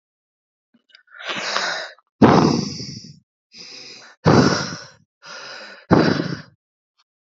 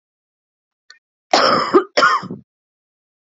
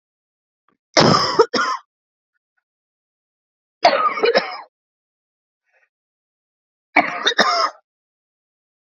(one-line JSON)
{"exhalation_length": "7.3 s", "exhalation_amplitude": 32767, "exhalation_signal_mean_std_ratio": 0.4, "cough_length": "3.2 s", "cough_amplitude": 28889, "cough_signal_mean_std_ratio": 0.38, "three_cough_length": "9.0 s", "three_cough_amplitude": 32767, "three_cough_signal_mean_std_ratio": 0.35, "survey_phase": "beta (2021-08-13 to 2022-03-07)", "age": "18-44", "gender": "Female", "wearing_mask": "No", "symptom_cough_any": true, "symptom_new_continuous_cough": true, "symptom_runny_or_blocked_nose": true, "symptom_sore_throat": true, "symptom_abdominal_pain": true, "symptom_fatigue": true, "symptom_fever_high_temperature": true, "symptom_headache": true, "symptom_change_to_sense_of_smell_or_taste": true, "symptom_onset": "4 days", "smoker_status": "Never smoked", "respiratory_condition_asthma": false, "respiratory_condition_other": false, "recruitment_source": "Test and Trace", "submission_delay": "1 day", "covid_test_result": "Positive", "covid_test_method": "ePCR"}